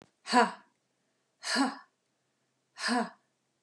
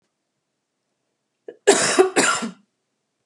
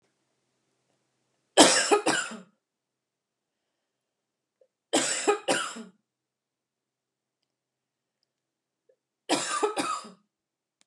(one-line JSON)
{"exhalation_length": "3.6 s", "exhalation_amplitude": 11558, "exhalation_signal_mean_std_ratio": 0.34, "cough_length": "3.3 s", "cough_amplitude": 29697, "cough_signal_mean_std_ratio": 0.35, "three_cough_length": "10.9 s", "three_cough_amplitude": 26817, "three_cough_signal_mean_std_ratio": 0.29, "survey_phase": "beta (2021-08-13 to 2022-03-07)", "age": "45-64", "gender": "Female", "wearing_mask": "No", "symptom_none": true, "smoker_status": "Current smoker (e-cigarettes or vapes only)", "respiratory_condition_asthma": false, "respiratory_condition_other": false, "recruitment_source": "REACT", "submission_delay": "1 day", "covid_test_result": "Negative", "covid_test_method": "RT-qPCR"}